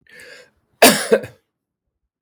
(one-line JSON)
{"cough_length": "2.2 s", "cough_amplitude": 32768, "cough_signal_mean_std_ratio": 0.28, "survey_phase": "beta (2021-08-13 to 2022-03-07)", "age": "65+", "gender": "Male", "wearing_mask": "No", "symptom_cough_any": true, "symptom_onset": "5 days", "smoker_status": "Never smoked", "respiratory_condition_asthma": false, "respiratory_condition_other": false, "recruitment_source": "REACT", "submission_delay": "1 day", "covid_test_result": "Positive", "covid_test_method": "RT-qPCR", "covid_ct_value": 20.8, "covid_ct_gene": "E gene", "influenza_a_test_result": "Negative", "influenza_b_test_result": "Negative"}